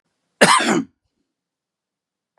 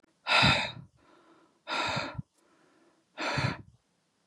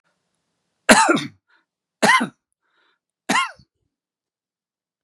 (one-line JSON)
{"cough_length": "2.4 s", "cough_amplitude": 32767, "cough_signal_mean_std_ratio": 0.31, "exhalation_length": "4.3 s", "exhalation_amplitude": 10528, "exhalation_signal_mean_std_ratio": 0.42, "three_cough_length": "5.0 s", "three_cough_amplitude": 32768, "three_cough_signal_mean_std_ratio": 0.29, "survey_phase": "beta (2021-08-13 to 2022-03-07)", "age": "45-64", "gender": "Male", "wearing_mask": "No", "symptom_none": true, "smoker_status": "Never smoked", "respiratory_condition_asthma": false, "respiratory_condition_other": false, "recruitment_source": "REACT", "submission_delay": "1 day", "covid_test_result": "Negative", "covid_test_method": "RT-qPCR", "influenza_a_test_result": "Negative", "influenza_b_test_result": "Negative"}